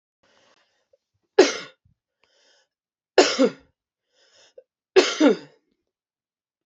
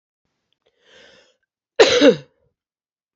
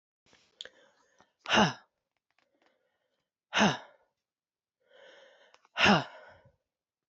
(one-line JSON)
{"three_cough_length": "6.7 s", "three_cough_amplitude": 28946, "three_cough_signal_mean_std_ratio": 0.25, "cough_length": "3.2 s", "cough_amplitude": 28393, "cough_signal_mean_std_ratio": 0.26, "exhalation_length": "7.1 s", "exhalation_amplitude": 10579, "exhalation_signal_mean_std_ratio": 0.25, "survey_phase": "beta (2021-08-13 to 2022-03-07)", "age": "18-44", "gender": "Female", "wearing_mask": "No", "symptom_cough_any": true, "symptom_runny_or_blocked_nose": true, "symptom_fatigue": true, "symptom_fever_high_temperature": true, "symptom_headache": true, "symptom_change_to_sense_of_smell_or_taste": true, "symptom_loss_of_taste": true, "symptom_other": true, "smoker_status": "Never smoked", "respiratory_condition_asthma": false, "respiratory_condition_other": false, "recruitment_source": "Test and Trace", "submission_delay": "2 days", "covid_test_result": "Positive", "covid_test_method": "RT-qPCR"}